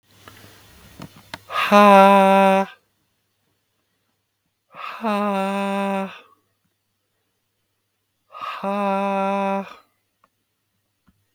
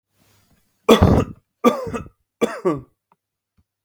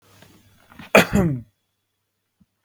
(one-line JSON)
{"exhalation_length": "11.3 s", "exhalation_amplitude": 32269, "exhalation_signal_mean_std_ratio": 0.39, "three_cough_length": "3.8 s", "three_cough_amplitude": 32768, "three_cough_signal_mean_std_ratio": 0.34, "cough_length": "2.6 s", "cough_amplitude": 32768, "cough_signal_mean_std_ratio": 0.28, "survey_phase": "beta (2021-08-13 to 2022-03-07)", "age": "18-44", "gender": "Male", "wearing_mask": "No", "symptom_none": true, "symptom_onset": "4 days", "smoker_status": "Never smoked", "respiratory_condition_asthma": false, "respiratory_condition_other": false, "recruitment_source": "REACT", "submission_delay": "11 days", "covid_test_result": "Negative", "covid_test_method": "RT-qPCR", "influenza_a_test_result": "Negative", "influenza_b_test_result": "Negative"}